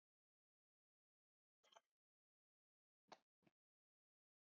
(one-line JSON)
{"cough_length": "4.5 s", "cough_amplitude": 150, "cough_signal_mean_std_ratio": 0.13, "survey_phase": "beta (2021-08-13 to 2022-03-07)", "age": "65+", "gender": "Female", "wearing_mask": "No", "symptom_none": true, "smoker_status": "Ex-smoker", "respiratory_condition_asthma": false, "respiratory_condition_other": false, "recruitment_source": "REACT", "submission_delay": "2 days", "covid_test_result": "Negative", "covid_test_method": "RT-qPCR", "influenza_a_test_result": "Negative", "influenza_b_test_result": "Negative"}